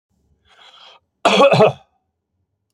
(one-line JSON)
{"cough_length": "2.7 s", "cough_amplitude": 30107, "cough_signal_mean_std_ratio": 0.35, "survey_phase": "alpha (2021-03-01 to 2021-08-12)", "age": "45-64", "gender": "Male", "wearing_mask": "No", "symptom_none": true, "smoker_status": "Ex-smoker", "respiratory_condition_asthma": false, "respiratory_condition_other": false, "recruitment_source": "REACT", "submission_delay": "1 day", "covid_test_result": "Negative", "covid_test_method": "RT-qPCR"}